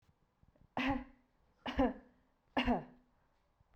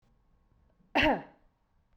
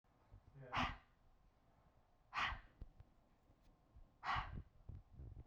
{"three_cough_length": "3.8 s", "three_cough_amplitude": 3263, "three_cough_signal_mean_std_ratio": 0.37, "cough_length": "2.0 s", "cough_amplitude": 8575, "cough_signal_mean_std_ratio": 0.3, "exhalation_length": "5.5 s", "exhalation_amplitude": 1217, "exhalation_signal_mean_std_ratio": 0.42, "survey_phase": "beta (2021-08-13 to 2022-03-07)", "age": "18-44", "gender": "Female", "wearing_mask": "No", "symptom_none": true, "smoker_status": "Ex-smoker", "respiratory_condition_asthma": false, "respiratory_condition_other": false, "recruitment_source": "REACT", "submission_delay": "1 day", "covid_test_result": "Negative", "covid_test_method": "RT-qPCR"}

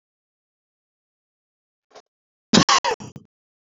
{"cough_length": "3.8 s", "cough_amplitude": 31365, "cough_signal_mean_std_ratio": 0.22, "survey_phase": "beta (2021-08-13 to 2022-03-07)", "age": "45-64", "gender": "Male", "wearing_mask": "No", "symptom_none": true, "smoker_status": "Never smoked", "respiratory_condition_asthma": false, "respiratory_condition_other": false, "recruitment_source": "REACT", "submission_delay": "1 day", "covid_test_result": "Negative", "covid_test_method": "RT-qPCR", "influenza_a_test_result": "Unknown/Void", "influenza_b_test_result": "Unknown/Void"}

